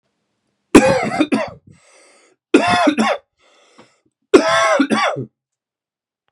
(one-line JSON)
{"three_cough_length": "6.3 s", "three_cough_amplitude": 32768, "three_cough_signal_mean_std_ratio": 0.44, "survey_phase": "beta (2021-08-13 to 2022-03-07)", "age": "18-44", "gender": "Male", "wearing_mask": "No", "symptom_cough_any": true, "symptom_runny_or_blocked_nose": true, "symptom_fatigue": true, "symptom_headache": true, "symptom_change_to_sense_of_smell_or_taste": true, "symptom_other": true, "symptom_onset": "2 days", "smoker_status": "Ex-smoker", "respiratory_condition_asthma": false, "respiratory_condition_other": false, "recruitment_source": "Test and Trace", "submission_delay": "1 day", "covid_test_result": "Positive", "covid_test_method": "RT-qPCR", "covid_ct_value": 19.4, "covid_ct_gene": "ORF1ab gene", "covid_ct_mean": 19.9, "covid_viral_load": "290000 copies/ml", "covid_viral_load_category": "Low viral load (10K-1M copies/ml)"}